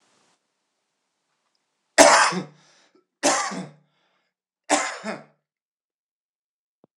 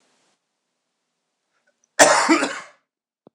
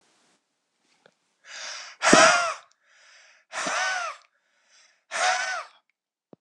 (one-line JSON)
{"three_cough_length": "7.0 s", "three_cough_amplitude": 26028, "three_cough_signal_mean_std_ratio": 0.27, "cough_length": "3.3 s", "cough_amplitude": 26028, "cough_signal_mean_std_ratio": 0.29, "exhalation_length": "6.4 s", "exhalation_amplitude": 26028, "exhalation_signal_mean_std_ratio": 0.36, "survey_phase": "alpha (2021-03-01 to 2021-08-12)", "age": "45-64", "gender": "Male", "wearing_mask": "No", "symptom_fatigue": true, "symptom_headache": true, "symptom_change_to_sense_of_smell_or_taste": true, "symptom_onset": "4 days", "smoker_status": "Never smoked", "respiratory_condition_asthma": false, "respiratory_condition_other": false, "recruitment_source": "Test and Trace", "submission_delay": "2 days", "covid_test_result": "Positive", "covid_test_method": "RT-qPCR", "covid_ct_value": 25.2, "covid_ct_gene": "N gene", "covid_ct_mean": 25.3, "covid_viral_load": "5000 copies/ml", "covid_viral_load_category": "Minimal viral load (< 10K copies/ml)"}